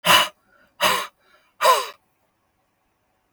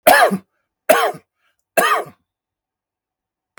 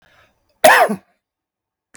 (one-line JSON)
{"exhalation_length": "3.3 s", "exhalation_amplitude": 31999, "exhalation_signal_mean_std_ratio": 0.35, "three_cough_length": "3.6 s", "three_cough_amplitude": 32768, "three_cough_signal_mean_std_ratio": 0.37, "cough_length": "2.0 s", "cough_amplitude": 32768, "cough_signal_mean_std_ratio": 0.31, "survey_phase": "beta (2021-08-13 to 2022-03-07)", "age": "45-64", "gender": "Male", "wearing_mask": "No", "symptom_shortness_of_breath": true, "symptom_headache": true, "smoker_status": "Ex-smoker", "respiratory_condition_asthma": false, "respiratory_condition_other": false, "recruitment_source": "Test and Trace", "submission_delay": "2 days", "covid_test_result": "Positive", "covid_test_method": "RT-qPCR", "covid_ct_value": 20.2, "covid_ct_gene": "ORF1ab gene", "covid_ct_mean": 21.0, "covid_viral_load": "130000 copies/ml", "covid_viral_load_category": "Low viral load (10K-1M copies/ml)"}